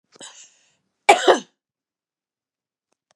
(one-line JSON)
{"cough_length": "3.2 s", "cough_amplitude": 32768, "cough_signal_mean_std_ratio": 0.21, "survey_phase": "beta (2021-08-13 to 2022-03-07)", "age": "45-64", "gender": "Female", "wearing_mask": "No", "symptom_none": true, "symptom_onset": "13 days", "smoker_status": "Never smoked", "respiratory_condition_asthma": true, "respiratory_condition_other": false, "recruitment_source": "REACT", "submission_delay": "2 days", "covid_test_result": "Negative", "covid_test_method": "RT-qPCR", "influenza_a_test_result": "Negative", "influenza_b_test_result": "Negative"}